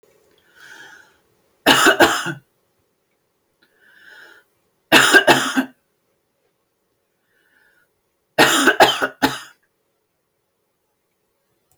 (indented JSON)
{
  "three_cough_length": "11.8 s",
  "three_cough_amplitude": 31439,
  "three_cough_signal_mean_std_ratio": 0.31,
  "survey_phase": "beta (2021-08-13 to 2022-03-07)",
  "age": "45-64",
  "gender": "Female",
  "wearing_mask": "No",
  "symptom_none": true,
  "smoker_status": "Ex-smoker",
  "respiratory_condition_asthma": false,
  "respiratory_condition_other": false,
  "recruitment_source": "REACT",
  "submission_delay": "2 days",
  "covid_test_result": "Negative",
  "covid_test_method": "RT-qPCR"
}